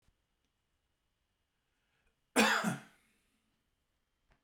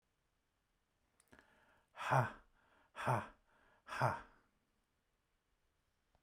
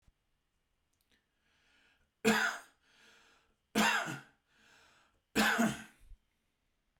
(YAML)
cough_length: 4.4 s
cough_amplitude: 6170
cough_signal_mean_std_ratio: 0.23
exhalation_length: 6.2 s
exhalation_amplitude: 3075
exhalation_signal_mean_std_ratio: 0.28
three_cough_length: 7.0 s
three_cough_amplitude: 5995
three_cough_signal_mean_std_ratio: 0.33
survey_phase: beta (2021-08-13 to 2022-03-07)
age: 45-64
gender: Male
wearing_mask: 'No'
symptom_none: true
smoker_status: Never smoked
respiratory_condition_asthma: false
respiratory_condition_other: false
recruitment_source: REACT
submission_delay: 2 days
covid_test_result: Negative
covid_test_method: RT-qPCR